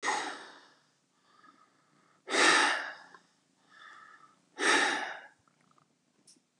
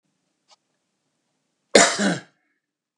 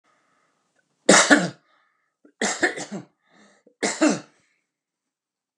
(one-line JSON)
{"exhalation_length": "6.6 s", "exhalation_amplitude": 10359, "exhalation_signal_mean_std_ratio": 0.38, "cough_length": "3.0 s", "cough_amplitude": 32768, "cough_signal_mean_std_ratio": 0.25, "three_cough_length": "5.6 s", "three_cough_amplitude": 31988, "three_cough_signal_mean_std_ratio": 0.3, "survey_phase": "beta (2021-08-13 to 2022-03-07)", "age": "65+", "gender": "Male", "wearing_mask": "No", "symptom_none": true, "smoker_status": "Ex-smoker", "respiratory_condition_asthma": false, "respiratory_condition_other": false, "recruitment_source": "REACT", "submission_delay": "1 day", "covid_test_result": "Negative", "covid_test_method": "RT-qPCR", "influenza_a_test_result": "Negative", "influenza_b_test_result": "Negative"}